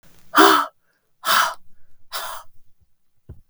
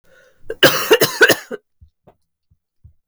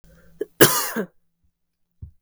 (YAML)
exhalation_length: 3.5 s
exhalation_amplitude: 32768
exhalation_signal_mean_std_ratio: 0.38
three_cough_length: 3.1 s
three_cough_amplitude: 32768
three_cough_signal_mean_std_ratio: 0.35
cough_length: 2.2 s
cough_amplitude: 32768
cough_signal_mean_std_ratio: 0.28
survey_phase: beta (2021-08-13 to 2022-03-07)
age: 18-44
gender: Female
wearing_mask: 'No'
symptom_cough_any: true
symptom_new_continuous_cough: true
symptom_runny_or_blocked_nose: true
symptom_shortness_of_breath: true
symptom_fatigue: true
symptom_headache: true
symptom_other: true
symptom_onset: 4 days
smoker_status: Never smoked
respiratory_condition_asthma: false
respiratory_condition_other: false
recruitment_source: Test and Trace
submission_delay: 2 days
covid_test_result: Positive
covid_test_method: RT-qPCR
covid_ct_value: 27.2
covid_ct_gene: N gene